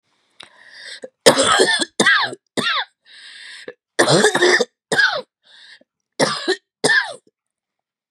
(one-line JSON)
{"three_cough_length": "8.1 s", "three_cough_amplitude": 32768, "three_cough_signal_mean_std_ratio": 0.47, "survey_phase": "beta (2021-08-13 to 2022-03-07)", "age": "45-64", "gender": "Female", "wearing_mask": "No", "symptom_none": true, "symptom_onset": "8 days", "smoker_status": "Never smoked", "respiratory_condition_asthma": false, "respiratory_condition_other": false, "recruitment_source": "REACT", "submission_delay": "1 day", "covid_test_result": "Negative", "covid_test_method": "RT-qPCR"}